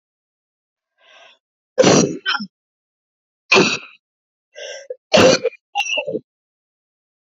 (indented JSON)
{
  "three_cough_length": "7.3 s",
  "three_cough_amplitude": 30538,
  "three_cough_signal_mean_std_ratio": 0.34,
  "survey_phase": "alpha (2021-03-01 to 2021-08-12)",
  "age": "45-64",
  "gender": "Female",
  "wearing_mask": "No",
  "symptom_cough_any": true,
  "symptom_new_continuous_cough": true,
  "symptom_shortness_of_breath": true,
  "symptom_diarrhoea": true,
  "symptom_fatigue": true,
  "symptom_fever_high_temperature": true,
  "symptom_headache": true,
  "symptom_change_to_sense_of_smell_or_taste": true,
  "symptom_loss_of_taste": true,
  "smoker_status": "Ex-smoker",
  "respiratory_condition_asthma": true,
  "respiratory_condition_other": true,
  "recruitment_source": "Test and Trace",
  "submission_delay": "4 days",
  "covid_test_result": "Positive",
  "covid_test_method": "LFT"
}